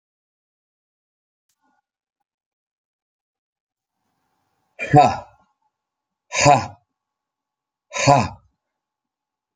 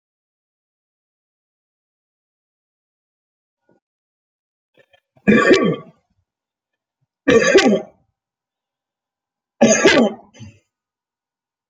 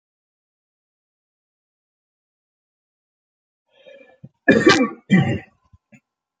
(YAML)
exhalation_length: 9.6 s
exhalation_amplitude: 30386
exhalation_signal_mean_std_ratio: 0.22
three_cough_length: 11.7 s
three_cough_amplitude: 32767
three_cough_signal_mean_std_ratio: 0.29
cough_length: 6.4 s
cough_amplitude: 32392
cough_signal_mean_std_ratio: 0.25
survey_phase: beta (2021-08-13 to 2022-03-07)
age: 45-64
gender: Male
wearing_mask: 'No'
symptom_cough_any: true
symptom_onset: 13 days
smoker_status: Never smoked
respiratory_condition_asthma: false
respiratory_condition_other: false
recruitment_source: REACT
submission_delay: 0 days
covid_test_result: Negative
covid_test_method: RT-qPCR